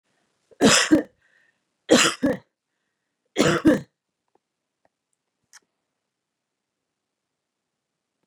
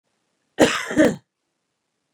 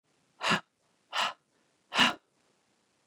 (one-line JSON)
{"three_cough_length": "8.3 s", "three_cough_amplitude": 25305, "three_cough_signal_mean_std_ratio": 0.27, "cough_length": "2.1 s", "cough_amplitude": 28555, "cough_signal_mean_std_ratio": 0.32, "exhalation_length": "3.1 s", "exhalation_amplitude": 11689, "exhalation_signal_mean_std_ratio": 0.31, "survey_phase": "beta (2021-08-13 to 2022-03-07)", "age": "45-64", "gender": "Female", "wearing_mask": "No", "symptom_sore_throat": true, "smoker_status": "Ex-smoker", "respiratory_condition_asthma": false, "respiratory_condition_other": false, "recruitment_source": "Test and Trace", "submission_delay": "2 days", "covid_test_result": "Negative", "covid_test_method": "RT-qPCR"}